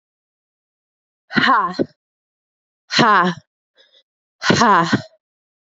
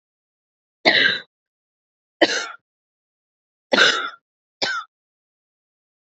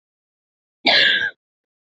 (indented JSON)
{
  "exhalation_length": "5.6 s",
  "exhalation_amplitude": 27923,
  "exhalation_signal_mean_std_ratio": 0.39,
  "three_cough_length": "6.1 s",
  "three_cough_amplitude": 32767,
  "three_cough_signal_mean_std_ratio": 0.31,
  "cough_length": "1.9 s",
  "cough_amplitude": 26975,
  "cough_signal_mean_std_ratio": 0.4,
  "survey_phase": "beta (2021-08-13 to 2022-03-07)",
  "age": "18-44",
  "gender": "Female",
  "wearing_mask": "No",
  "symptom_cough_any": true,
  "symptom_new_continuous_cough": true,
  "symptom_runny_or_blocked_nose": true,
  "symptom_shortness_of_breath": true,
  "symptom_sore_throat": true,
  "symptom_fatigue": true,
  "symptom_fever_high_temperature": true,
  "symptom_headache": true,
  "smoker_status": "Ex-smoker",
  "respiratory_condition_asthma": false,
  "respiratory_condition_other": false,
  "recruitment_source": "Test and Trace",
  "submission_delay": "1 day",
  "covid_test_result": "Positive",
  "covid_test_method": "RT-qPCR",
  "covid_ct_value": 19.4,
  "covid_ct_gene": "ORF1ab gene"
}